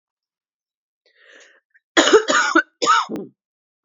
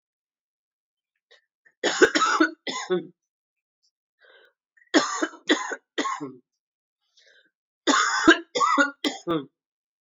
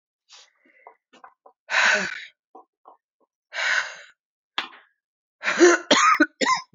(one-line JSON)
{"cough_length": "3.8 s", "cough_amplitude": 32587, "cough_signal_mean_std_ratio": 0.37, "three_cough_length": "10.1 s", "three_cough_amplitude": 24012, "three_cough_signal_mean_std_ratio": 0.38, "exhalation_length": "6.7 s", "exhalation_amplitude": 24367, "exhalation_signal_mean_std_ratio": 0.38, "survey_phase": "beta (2021-08-13 to 2022-03-07)", "age": "45-64", "gender": "Female", "wearing_mask": "No", "symptom_cough_any": true, "symptom_runny_or_blocked_nose": true, "symptom_fatigue": true, "symptom_onset": "2 days", "smoker_status": "Never smoked", "respiratory_condition_asthma": false, "respiratory_condition_other": false, "recruitment_source": "Test and Trace", "submission_delay": "1 day", "covid_test_result": "Positive", "covid_test_method": "RT-qPCR", "covid_ct_value": 18.8, "covid_ct_gene": "N gene"}